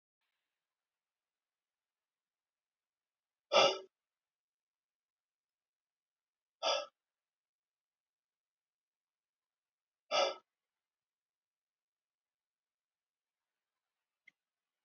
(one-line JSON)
{"exhalation_length": "14.8 s", "exhalation_amplitude": 5886, "exhalation_signal_mean_std_ratio": 0.15, "survey_phase": "beta (2021-08-13 to 2022-03-07)", "age": "45-64", "gender": "Male", "wearing_mask": "No", "symptom_none": true, "symptom_onset": "2 days", "smoker_status": "Never smoked", "respiratory_condition_asthma": false, "respiratory_condition_other": false, "recruitment_source": "REACT", "submission_delay": "0 days", "covid_test_result": "Negative", "covid_test_method": "RT-qPCR"}